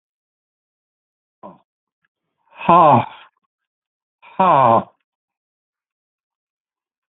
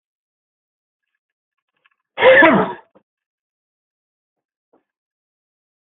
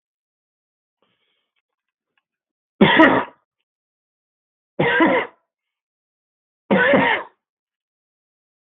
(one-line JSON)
{"exhalation_length": "7.1 s", "exhalation_amplitude": 32766, "exhalation_signal_mean_std_ratio": 0.27, "cough_length": "5.8 s", "cough_amplitude": 32768, "cough_signal_mean_std_ratio": 0.23, "three_cough_length": "8.7 s", "three_cough_amplitude": 32768, "three_cough_signal_mean_std_ratio": 0.31, "survey_phase": "beta (2021-08-13 to 2022-03-07)", "age": "65+", "gender": "Male", "wearing_mask": "No", "symptom_none": true, "smoker_status": "Ex-smoker", "respiratory_condition_asthma": false, "respiratory_condition_other": false, "recruitment_source": "REACT", "submission_delay": "7 days", "covid_test_result": "Negative", "covid_test_method": "RT-qPCR"}